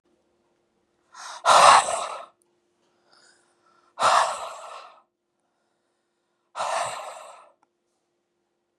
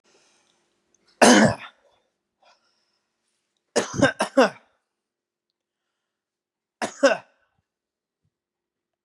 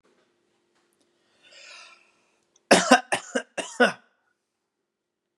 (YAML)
exhalation_length: 8.8 s
exhalation_amplitude: 28236
exhalation_signal_mean_std_ratio: 0.29
three_cough_length: 9.0 s
three_cough_amplitude: 30626
three_cough_signal_mean_std_ratio: 0.24
cough_length: 5.4 s
cough_amplitude: 28232
cough_signal_mean_std_ratio: 0.23
survey_phase: beta (2021-08-13 to 2022-03-07)
age: 18-44
gender: Male
wearing_mask: 'No'
symptom_cough_any: true
smoker_status: Never smoked
respiratory_condition_asthma: false
respiratory_condition_other: false
recruitment_source: REACT
submission_delay: 2 days
covid_test_result: Negative
covid_test_method: RT-qPCR